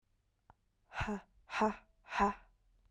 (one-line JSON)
{"exhalation_length": "2.9 s", "exhalation_amplitude": 3961, "exhalation_signal_mean_std_ratio": 0.38, "survey_phase": "beta (2021-08-13 to 2022-03-07)", "age": "18-44", "gender": "Female", "wearing_mask": "No", "symptom_cough_any": true, "symptom_runny_or_blocked_nose": true, "symptom_shortness_of_breath": true, "symptom_sore_throat": true, "symptom_fatigue": true, "symptom_headache": true, "symptom_onset": "3 days", "smoker_status": "Current smoker (e-cigarettes or vapes only)", "respiratory_condition_asthma": true, "respiratory_condition_other": false, "recruitment_source": "Test and Trace", "submission_delay": "2 days", "covid_test_result": "Positive", "covid_test_method": "ePCR"}